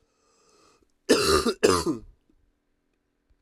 cough_length: 3.4 s
cough_amplitude: 16975
cough_signal_mean_std_ratio: 0.37
survey_phase: alpha (2021-03-01 to 2021-08-12)
age: 18-44
gender: Male
wearing_mask: 'No'
symptom_cough_any: true
symptom_new_continuous_cough: true
symptom_shortness_of_breath: true
symptom_fatigue: true
symptom_fever_high_temperature: true
symptom_headache: true
symptom_change_to_sense_of_smell_or_taste: true
symptom_onset: 4 days
smoker_status: Current smoker (1 to 10 cigarettes per day)
respiratory_condition_asthma: false
respiratory_condition_other: false
recruitment_source: Test and Trace
submission_delay: 2 days
covid_test_result: Positive
covid_test_method: RT-qPCR
covid_ct_value: 18.7
covid_ct_gene: ORF1ab gene
covid_ct_mean: 19.2
covid_viral_load: 500000 copies/ml
covid_viral_load_category: Low viral load (10K-1M copies/ml)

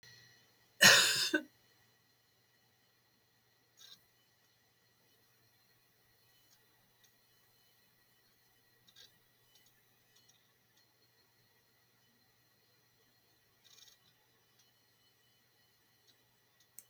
cough_length: 16.9 s
cough_amplitude: 11854
cough_signal_mean_std_ratio: 0.15
survey_phase: beta (2021-08-13 to 2022-03-07)
age: 65+
gender: Female
wearing_mask: 'No'
symptom_shortness_of_breath: true
symptom_fatigue: true
smoker_status: Ex-smoker
respiratory_condition_asthma: true
respiratory_condition_other: false
recruitment_source: REACT
submission_delay: 2 days
covid_test_result: Negative
covid_test_method: RT-qPCR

